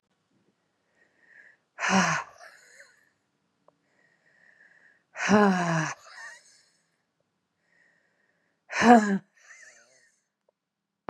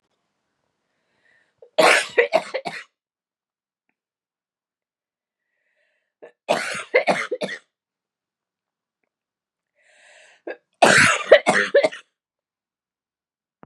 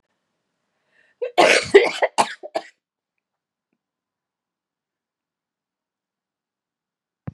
exhalation_length: 11.1 s
exhalation_amplitude: 24443
exhalation_signal_mean_std_ratio: 0.28
three_cough_length: 13.7 s
three_cough_amplitude: 32567
three_cough_signal_mean_std_ratio: 0.28
cough_length: 7.3 s
cough_amplitude: 32733
cough_signal_mean_std_ratio: 0.22
survey_phase: beta (2021-08-13 to 2022-03-07)
age: 45-64
gender: Female
wearing_mask: 'No'
symptom_runny_or_blocked_nose: true
symptom_shortness_of_breath: true
symptom_fatigue: true
symptom_headache: true
symptom_onset: 2 days
smoker_status: Ex-smoker
respiratory_condition_asthma: false
respiratory_condition_other: false
recruitment_source: Test and Trace
submission_delay: 2 days
covid_test_result: Positive
covid_test_method: RT-qPCR
covid_ct_value: 14.9
covid_ct_gene: ORF1ab gene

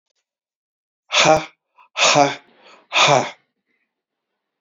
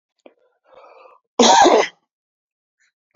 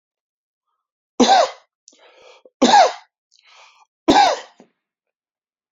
exhalation_length: 4.6 s
exhalation_amplitude: 31600
exhalation_signal_mean_std_ratio: 0.36
cough_length: 3.2 s
cough_amplitude: 31789
cough_signal_mean_std_ratio: 0.33
three_cough_length: 5.7 s
three_cough_amplitude: 27799
three_cough_signal_mean_std_ratio: 0.32
survey_phase: beta (2021-08-13 to 2022-03-07)
age: 45-64
gender: Male
wearing_mask: 'No'
symptom_none: true
smoker_status: Never smoked
respiratory_condition_asthma: false
respiratory_condition_other: false
recruitment_source: REACT
submission_delay: 3 days
covid_test_result: Negative
covid_test_method: RT-qPCR
influenza_a_test_result: Negative
influenza_b_test_result: Negative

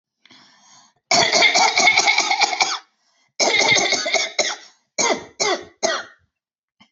cough_length: 6.9 s
cough_amplitude: 28492
cough_signal_mean_std_ratio: 0.58
survey_phase: beta (2021-08-13 to 2022-03-07)
age: 45-64
gender: Female
wearing_mask: 'No'
symptom_runny_or_blocked_nose: true
symptom_abdominal_pain: true
symptom_onset: 12 days
smoker_status: Never smoked
respiratory_condition_asthma: true
respiratory_condition_other: false
recruitment_source: REACT
submission_delay: 2 days
covid_test_result: Negative
covid_test_method: RT-qPCR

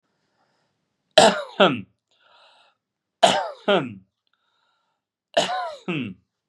three_cough_length: 6.5 s
three_cough_amplitude: 32767
three_cough_signal_mean_std_ratio: 0.32
survey_phase: beta (2021-08-13 to 2022-03-07)
age: 18-44
gender: Male
wearing_mask: 'No'
symptom_cough_any: true
symptom_runny_or_blocked_nose: true
symptom_sore_throat: true
symptom_fatigue: true
symptom_fever_high_temperature: true
symptom_headache: true
symptom_onset: 3 days
smoker_status: Never smoked
respiratory_condition_asthma: false
respiratory_condition_other: false
recruitment_source: Test and Trace
submission_delay: 2 days
covid_test_result: Positive
covid_test_method: ePCR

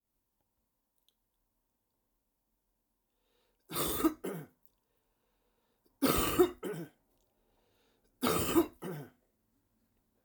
cough_length: 10.2 s
cough_amplitude: 6819
cough_signal_mean_std_ratio: 0.31
survey_phase: alpha (2021-03-01 to 2021-08-12)
age: 65+
gender: Male
wearing_mask: 'No'
symptom_cough_any: true
symptom_headache: true
symptom_onset: 3 days
smoker_status: Never smoked
respiratory_condition_asthma: false
respiratory_condition_other: false
recruitment_source: Test and Trace
submission_delay: 1 day
covid_test_result: Positive
covid_test_method: RT-qPCR
covid_ct_value: 13.9
covid_ct_gene: ORF1ab gene
covid_ct_mean: 14.8
covid_viral_load: 14000000 copies/ml
covid_viral_load_category: High viral load (>1M copies/ml)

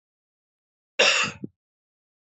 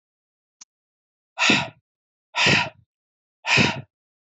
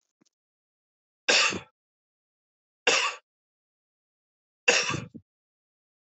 cough_length: 2.3 s
cough_amplitude: 16059
cough_signal_mean_std_ratio: 0.3
exhalation_length: 4.4 s
exhalation_amplitude: 18849
exhalation_signal_mean_std_ratio: 0.36
three_cough_length: 6.1 s
three_cough_amplitude: 16142
three_cough_signal_mean_std_ratio: 0.28
survey_phase: beta (2021-08-13 to 2022-03-07)
age: 18-44
gender: Male
wearing_mask: 'No'
symptom_cough_any: true
symptom_runny_or_blocked_nose: true
symptom_sore_throat: true
symptom_fatigue: true
symptom_headache: true
smoker_status: Never smoked
respiratory_condition_asthma: false
respiratory_condition_other: false
recruitment_source: Test and Trace
submission_delay: 2 days
covid_test_result: Positive
covid_test_method: RT-qPCR
covid_ct_value: 19.9
covid_ct_gene: ORF1ab gene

